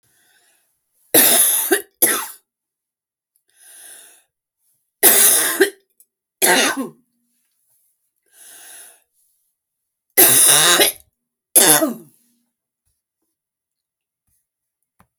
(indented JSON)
{
  "three_cough_length": "15.2 s",
  "three_cough_amplitude": 32768,
  "three_cough_signal_mean_std_ratio": 0.35,
  "survey_phase": "beta (2021-08-13 to 2022-03-07)",
  "age": "45-64",
  "gender": "Female",
  "wearing_mask": "No",
  "symptom_runny_or_blocked_nose": true,
  "symptom_abdominal_pain": true,
  "symptom_fatigue": true,
  "symptom_other": true,
  "smoker_status": "Never smoked",
  "respiratory_condition_asthma": true,
  "respiratory_condition_other": false,
  "recruitment_source": "REACT",
  "submission_delay": "1 day",
  "covid_test_result": "Negative",
  "covid_test_method": "RT-qPCR",
  "influenza_a_test_result": "Unknown/Void",
  "influenza_b_test_result": "Unknown/Void"
}